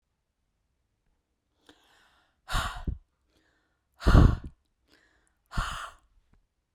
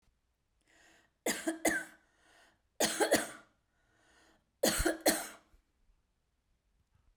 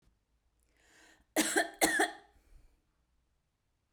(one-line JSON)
{"exhalation_length": "6.7 s", "exhalation_amplitude": 17354, "exhalation_signal_mean_std_ratio": 0.23, "three_cough_length": "7.2 s", "three_cough_amplitude": 7127, "three_cough_signal_mean_std_ratio": 0.34, "cough_length": "3.9 s", "cough_amplitude": 8939, "cough_signal_mean_std_ratio": 0.31, "survey_phase": "beta (2021-08-13 to 2022-03-07)", "age": "45-64", "gender": "Female", "wearing_mask": "No", "symptom_none": true, "smoker_status": "Never smoked", "respiratory_condition_asthma": false, "respiratory_condition_other": false, "recruitment_source": "REACT", "submission_delay": "1 day", "covid_test_result": "Negative", "covid_test_method": "RT-qPCR"}